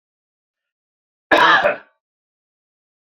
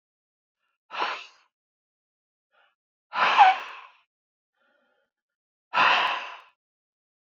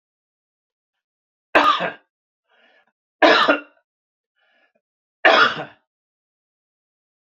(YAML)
cough_length: 3.1 s
cough_amplitude: 28974
cough_signal_mean_std_ratio: 0.3
exhalation_length: 7.3 s
exhalation_amplitude: 22740
exhalation_signal_mean_std_ratio: 0.29
three_cough_length: 7.3 s
three_cough_amplitude: 27969
three_cough_signal_mean_std_ratio: 0.29
survey_phase: beta (2021-08-13 to 2022-03-07)
age: 45-64
gender: Male
wearing_mask: 'No'
symptom_none: true
smoker_status: Never smoked
respiratory_condition_asthma: false
respiratory_condition_other: false
recruitment_source: REACT
submission_delay: 3 days
covid_test_result: Negative
covid_test_method: RT-qPCR
influenza_a_test_result: Unknown/Void
influenza_b_test_result: Unknown/Void